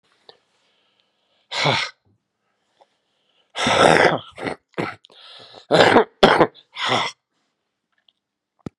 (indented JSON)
{
  "exhalation_length": "8.8 s",
  "exhalation_amplitude": 32768,
  "exhalation_signal_mean_std_ratio": 0.35,
  "survey_phase": "beta (2021-08-13 to 2022-03-07)",
  "age": "65+",
  "gender": "Male",
  "wearing_mask": "No",
  "symptom_cough_any": true,
  "symptom_new_continuous_cough": true,
  "symptom_runny_or_blocked_nose": true,
  "symptom_sore_throat": true,
  "symptom_fatigue": true,
  "symptom_change_to_sense_of_smell_or_taste": true,
  "symptom_loss_of_taste": true,
  "symptom_onset": "5 days",
  "smoker_status": "Never smoked",
  "respiratory_condition_asthma": false,
  "respiratory_condition_other": false,
  "recruitment_source": "Test and Trace",
  "submission_delay": "2 days",
  "covid_test_result": "Positive",
  "covid_test_method": "RT-qPCR",
  "covid_ct_value": 14.3,
  "covid_ct_gene": "N gene",
  "covid_ct_mean": 14.5,
  "covid_viral_load": "17000000 copies/ml",
  "covid_viral_load_category": "High viral load (>1M copies/ml)"
}